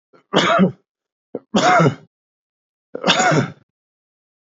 {"three_cough_length": "4.4 s", "three_cough_amplitude": 27411, "three_cough_signal_mean_std_ratio": 0.45, "survey_phase": "beta (2021-08-13 to 2022-03-07)", "age": "45-64", "gender": "Male", "wearing_mask": "No", "symptom_cough_any": true, "symptom_runny_or_blocked_nose": true, "symptom_headache": true, "symptom_onset": "2 days", "smoker_status": "Ex-smoker", "respiratory_condition_asthma": false, "respiratory_condition_other": false, "recruitment_source": "Test and Trace", "submission_delay": "1 day", "covid_test_result": "Positive", "covid_test_method": "RT-qPCR", "covid_ct_value": 17.4, "covid_ct_gene": "ORF1ab gene", "covid_ct_mean": 17.7, "covid_viral_load": "1600000 copies/ml", "covid_viral_load_category": "High viral load (>1M copies/ml)"}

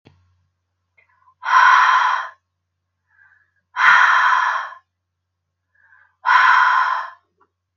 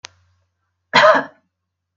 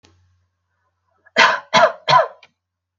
{"exhalation_length": "7.8 s", "exhalation_amplitude": 30414, "exhalation_signal_mean_std_ratio": 0.47, "cough_length": "2.0 s", "cough_amplitude": 32768, "cough_signal_mean_std_ratio": 0.31, "three_cough_length": "3.0 s", "three_cough_amplitude": 32768, "three_cough_signal_mean_std_ratio": 0.35, "survey_phase": "beta (2021-08-13 to 2022-03-07)", "age": "45-64", "gender": "Female", "wearing_mask": "No", "symptom_none": true, "smoker_status": "Never smoked", "respiratory_condition_asthma": false, "respiratory_condition_other": false, "recruitment_source": "REACT", "submission_delay": "5 days", "covid_test_result": "Negative", "covid_test_method": "RT-qPCR", "covid_ct_value": 39.0, "covid_ct_gene": "N gene", "influenza_a_test_result": "Negative", "influenza_b_test_result": "Negative"}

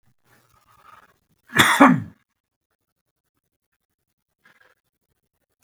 {"cough_length": "5.6 s", "cough_amplitude": 32768, "cough_signal_mean_std_ratio": 0.21, "survey_phase": "beta (2021-08-13 to 2022-03-07)", "age": "65+", "gender": "Male", "wearing_mask": "No", "symptom_none": true, "smoker_status": "Never smoked", "respiratory_condition_asthma": false, "respiratory_condition_other": false, "recruitment_source": "REACT", "submission_delay": "10 days", "covid_test_result": "Negative", "covid_test_method": "RT-qPCR"}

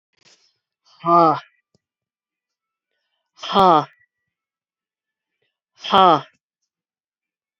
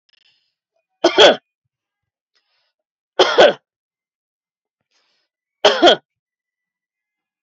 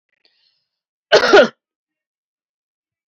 {"exhalation_length": "7.6 s", "exhalation_amplitude": 28498, "exhalation_signal_mean_std_ratio": 0.25, "three_cough_length": "7.4 s", "three_cough_amplitude": 30991, "three_cough_signal_mean_std_ratio": 0.26, "cough_length": "3.1 s", "cough_amplitude": 32768, "cough_signal_mean_std_ratio": 0.26, "survey_phase": "beta (2021-08-13 to 2022-03-07)", "age": "45-64", "gender": "Female", "wearing_mask": "No", "symptom_none": true, "smoker_status": "Never smoked", "respiratory_condition_asthma": false, "respiratory_condition_other": false, "recruitment_source": "REACT", "submission_delay": "2 days", "covid_test_result": "Negative", "covid_test_method": "RT-qPCR", "influenza_a_test_result": "Negative", "influenza_b_test_result": "Negative"}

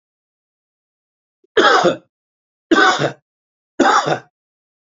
{"three_cough_length": "4.9 s", "three_cough_amplitude": 29187, "three_cough_signal_mean_std_ratio": 0.38, "survey_phase": "alpha (2021-03-01 to 2021-08-12)", "age": "65+", "gender": "Male", "wearing_mask": "No", "symptom_none": true, "smoker_status": "Never smoked", "respiratory_condition_asthma": false, "respiratory_condition_other": false, "recruitment_source": "REACT", "submission_delay": "3 days", "covid_test_result": "Negative", "covid_test_method": "RT-qPCR"}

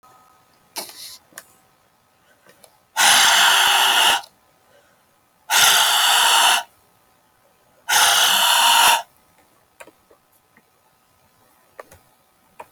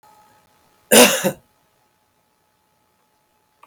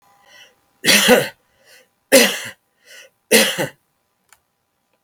{"exhalation_length": "12.7 s", "exhalation_amplitude": 28540, "exhalation_signal_mean_std_ratio": 0.47, "cough_length": "3.7 s", "cough_amplitude": 32768, "cough_signal_mean_std_ratio": 0.24, "three_cough_length": "5.0 s", "three_cough_amplitude": 32768, "three_cough_signal_mean_std_ratio": 0.35, "survey_phase": "beta (2021-08-13 to 2022-03-07)", "age": "65+", "gender": "Male", "wearing_mask": "No", "symptom_none": true, "smoker_status": "Never smoked", "respiratory_condition_asthma": false, "respiratory_condition_other": false, "recruitment_source": "REACT", "submission_delay": "1 day", "covid_test_result": "Negative", "covid_test_method": "RT-qPCR"}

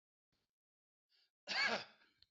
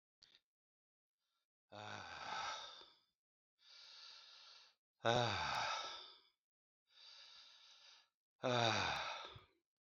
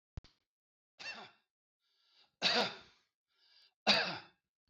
{"cough_length": "2.3 s", "cough_amplitude": 1560, "cough_signal_mean_std_ratio": 0.31, "exhalation_length": "9.8 s", "exhalation_amplitude": 3715, "exhalation_signal_mean_std_ratio": 0.4, "three_cough_length": "4.7 s", "three_cough_amplitude": 5015, "three_cough_signal_mean_std_ratio": 0.3, "survey_phase": "alpha (2021-03-01 to 2021-08-12)", "age": "65+", "gender": "Male", "wearing_mask": "No", "symptom_shortness_of_breath": true, "symptom_fatigue": true, "symptom_headache": true, "smoker_status": "Ex-smoker", "respiratory_condition_asthma": false, "respiratory_condition_other": false, "recruitment_source": "REACT", "submission_delay": "1 day", "covid_test_result": "Negative", "covid_test_method": "RT-qPCR"}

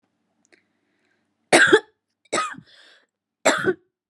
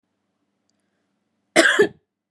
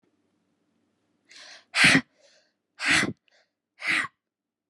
{"three_cough_length": "4.1 s", "three_cough_amplitude": 29173, "three_cough_signal_mean_std_ratio": 0.3, "cough_length": "2.3 s", "cough_amplitude": 32767, "cough_signal_mean_std_ratio": 0.29, "exhalation_length": "4.7 s", "exhalation_amplitude": 17521, "exhalation_signal_mean_std_ratio": 0.31, "survey_phase": "beta (2021-08-13 to 2022-03-07)", "age": "18-44", "gender": "Female", "wearing_mask": "No", "symptom_cough_any": true, "symptom_new_continuous_cough": true, "symptom_shortness_of_breath": true, "symptom_sore_throat": true, "symptom_diarrhoea": true, "symptom_fatigue": true, "symptom_headache": true, "symptom_onset": "2 days", "smoker_status": "Ex-smoker", "respiratory_condition_asthma": false, "respiratory_condition_other": false, "recruitment_source": "Test and Trace", "submission_delay": "1 day", "covid_test_result": "Positive", "covid_test_method": "RT-qPCR", "covid_ct_value": 31.0, "covid_ct_gene": "N gene"}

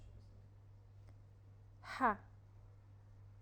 {"exhalation_length": "3.4 s", "exhalation_amplitude": 3169, "exhalation_signal_mean_std_ratio": 0.37, "survey_phase": "alpha (2021-03-01 to 2021-08-12)", "age": "18-44", "gender": "Female", "wearing_mask": "No", "symptom_none": true, "smoker_status": "Never smoked", "respiratory_condition_asthma": false, "respiratory_condition_other": false, "recruitment_source": "REACT", "submission_delay": "1 day", "covid_test_result": "Negative", "covid_test_method": "RT-qPCR"}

